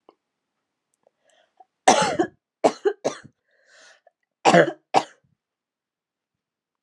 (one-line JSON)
{"three_cough_length": "6.8 s", "three_cough_amplitude": 32344, "three_cough_signal_mean_std_ratio": 0.26, "survey_phase": "alpha (2021-03-01 to 2021-08-12)", "age": "18-44", "gender": "Female", "wearing_mask": "No", "symptom_cough_any": true, "symptom_fatigue": true, "symptom_headache": true, "symptom_change_to_sense_of_smell_or_taste": true, "smoker_status": "Never smoked", "respiratory_condition_asthma": false, "respiratory_condition_other": false, "recruitment_source": "Test and Trace", "submission_delay": "3 days", "covid_test_result": "Positive", "covid_test_method": "RT-qPCR", "covid_ct_value": 17.7, "covid_ct_gene": "ORF1ab gene", "covid_ct_mean": 18.2, "covid_viral_load": "1100000 copies/ml", "covid_viral_load_category": "High viral load (>1M copies/ml)"}